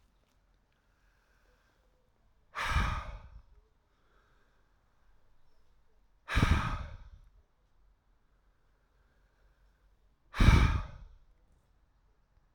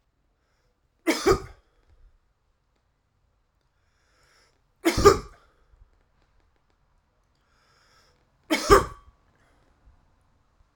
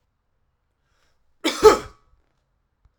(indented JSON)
{
  "exhalation_length": "12.5 s",
  "exhalation_amplitude": 12708,
  "exhalation_signal_mean_std_ratio": 0.27,
  "three_cough_length": "10.8 s",
  "three_cough_amplitude": 32364,
  "three_cough_signal_mean_std_ratio": 0.21,
  "cough_length": "3.0 s",
  "cough_amplitude": 32767,
  "cough_signal_mean_std_ratio": 0.2,
  "survey_phase": "alpha (2021-03-01 to 2021-08-12)",
  "age": "45-64",
  "gender": "Male",
  "wearing_mask": "No",
  "symptom_none": true,
  "smoker_status": "Never smoked",
  "respiratory_condition_asthma": false,
  "respiratory_condition_other": false,
  "recruitment_source": "REACT",
  "submission_delay": "1 day",
  "covid_test_result": "Negative",
  "covid_test_method": "RT-qPCR"
}